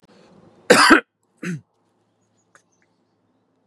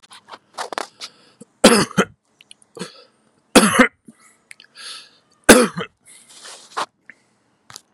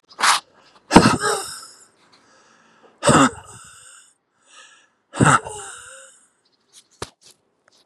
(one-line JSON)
{"cough_length": "3.7 s", "cough_amplitude": 32767, "cough_signal_mean_std_ratio": 0.25, "three_cough_length": "7.9 s", "three_cough_amplitude": 32768, "three_cough_signal_mean_std_ratio": 0.27, "exhalation_length": "7.9 s", "exhalation_amplitude": 32768, "exhalation_signal_mean_std_ratio": 0.31, "survey_phase": "beta (2021-08-13 to 2022-03-07)", "age": "45-64", "gender": "Male", "wearing_mask": "No", "symptom_none": true, "smoker_status": "Never smoked", "respiratory_condition_asthma": false, "respiratory_condition_other": false, "recruitment_source": "REACT", "submission_delay": "1 day", "covid_test_result": "Negative", "covid_test_method": "RT-qPCR", "influenza_a_test_result": "Negative", "influenza_b_test_result": "Negative"}